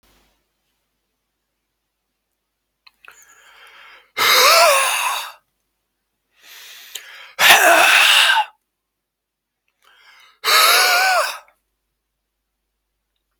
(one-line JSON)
{"exhalation_length": "13.4 s", "exhalation_amplitude": 32767, "exhalation_signal_mean_std_ratio": 0.4, "survey_phase": "beta (2021-08-13 to 2022-03-07)", "age": "45-64", "gender": "Male", "wearing_mask": "No", "symptom_none": true, "smoker_status": "Never smoked", "respiratory_condition_asthma": false, "respiratory_condition_other": false, "recruitment_source": "REACT", "submission_delay": "0 days", "covid_test_result": "Negative", "covid_test_method": "RT-qPCR"}